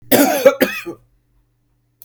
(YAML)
cough_length: 2.0 s
cough_amplitude: 32768
cough_signal_mean_std_ratio: 0.41
survey_phase: beta (2021-08-13 to 2022-03-07)
age: 45-64
gender: Male
wearing_mask: 'No'
symptom_fatigue: true
symptom_onset: 9 days
smoker_status: Ex-smoker
respiratory_condition_asthma: false
respiratory_condition_other: false
recruitment_source: REACT
submission_delay: 5 days
covid_test_result: Negative
covid_test_method: RT-qPCR
influenza_a_test_result: Negative
influenza_b_test_result: Negative